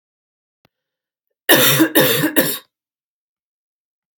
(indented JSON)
{
  "three_cough_length": "4.2 s",
  "three_cough_amplitude": 32768,
  "three_cough_signal_mean_std_ratio": 0.38,
  "survey_phase": "beta (2021-08-13 to 2022-03-07)",
  "age": "18-44",
  "gender": "Female",
  "wearing_mask": "No",
  "symptom_cough_any": true,
  "symptom_runny_or_blocked_nose": true,
  "symptom_fatigue": true,
  "symptom_headache": true,
  "symptom_change_to_sense_of_smell_or_taste": true,
  "symptom_loss_of_taste": true,
  "symptom_onset": "4 days",
  "smoker_status": "Never smoked",
  "respiratory_condition_asthma": false,
  "respiratory_condition_other": false,
  "recruitment_source": "Test and Trace",
  "submission_delay": "2 days",
  "covid_test_result": "Positive",
  "covid_test_method": "RT-qPCR",
  "covid_ct_value": 20.3,
  "covid_ct_gene": "ORF1ab gene",
  "covid_ct_mean": 21.3,
  "covid_viral_load": "100000 copies/ml",
  "covid_viral_load_category": "Low viral load (10K-1M copies/ml)"
}